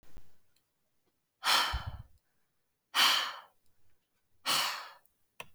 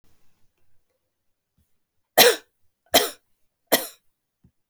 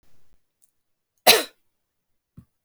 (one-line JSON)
{"exhalation_length": "5.5 s", "exhalation_amplitude": 8253, "exhalation_signal_mean_std_ratio": 0.4, "three_cough_length": "4.7 s", "three_cough_amplitude": 32768, "three_cough_signal_mean_std_ratio": 0.22, "cough_length": "2.6 s", "cough_amplitude": 32768, "cough_signal_mean_std_ratio": 0.19, "survey_phase": "beta (2021-08-13 to 2022-03-07)", "age": "18-44", "gender": "Female", "wearing_mask": "No", "symptom_runny_or_blocked_nose": true, "smoker_status": "Never smoked", "respiratory_condition_asthma": true, "respiratory_condition_other": false, "recruitment_source": "REACT", "submission_delay": "2 days", "covid_test_result": "Negative", "covid_test_method": "RT-qPCR"}